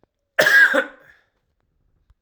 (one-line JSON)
{"cough_length": "2.2 s", "cough_amplitude": 25699, "cough_signal_mean_std_ratio": 0.37, "survey_phase": "alpha (2021-03-01 to 2021-08-12)", "age": "45-64", "gender": "Male", "wearing_mask": "No", "symptom_none": true, "smoker_status": "Ex-smoker", "respiratory_condition_asthma": false, "respiratory_condition_other": false, "recruitment_source": "Test and Trace", "submission_delay": "1 day", "covid_test_result": "Positive", "covid_test_method": "RT-qPCR", "covid_ct_value": 12.1, "covid_ct_gene": "ORF1ab gene", "covid_ct_mean": 12.4, "covid_viral_load": "88000000 copies/ml", "covid_viral_load_category": "High viral load (>1M copies/ml)"}